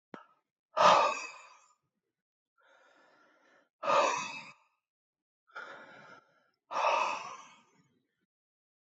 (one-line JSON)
{"exhalation_length": "8.9 s", "exhalation_amplitude": 9459, "exhalation_signal_mean_std_ratio": 0.32, "survey_phase": "beta (2021-08-13 to 2022-03-07)", "age": "18-44", "gender": "Male", "wearing_mask": "No", "symptom_cough_any": true, "symptom_runny_or_blocked_nose": true, "symptom_shortness_of_breath": true, "symptom_sore_throat": true, "smoker_status": "Ex-smoker", "respiratory_condition_asthma": false, "respiratory_condition_other": false, "recruitment_source": "Test and Trace", "submission_delay": "2 days", "covid_test_result": "Positive", "covid_test_method": "RT-qPCR", "covid_ct_value": 32.5, "covid_ct_gene": "N gene"}